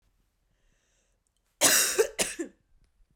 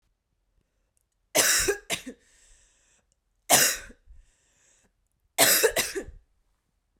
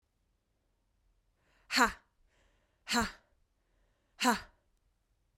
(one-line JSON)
{"cough_length": "3.2 s", "cough_amplitude": 19150, "cough_signal_mean_std_ratio": 0.34, "three_cough_length": "7.0 s", "three_cough_amplitude": 22835, "three_cough_signal_mean_std_ratio": 0.34, "exhalation_length": "5.4 s", "exhalation_amplitude": 8135, "exhalation_signal_mean_std_ratio": 0.25, "survey_phase": "beta (2021-08-13 to 2022-03-07)", "age": "18-44", "gender": "Female", "wearing_mask": "No", "symptom_cough_any": true, "symptom_new_continuous_cough": true, "symptom_runny_or_blocked_nose": true, "symptom_sore_throat": true, "symptom_onset": "3 days", "smoker_status": "Never smoked", "respiratory_condition_asthma": false, "respiratory_condition_other": false, "recruitment_source": "Test and Trace", "submission_delay": "2 days", "covid_test_result": "Positive", "covid_test_method": "RT-qPCR", "covid_ct_value": 20.6, "covid_ct_gene": "ORF1ab gene", "covid_ct_mean": 20.8, "covid_viral_load": "150000 copies/ml", "covid_viral_load_category": "Low viral load (10K-1M copies/ml)"}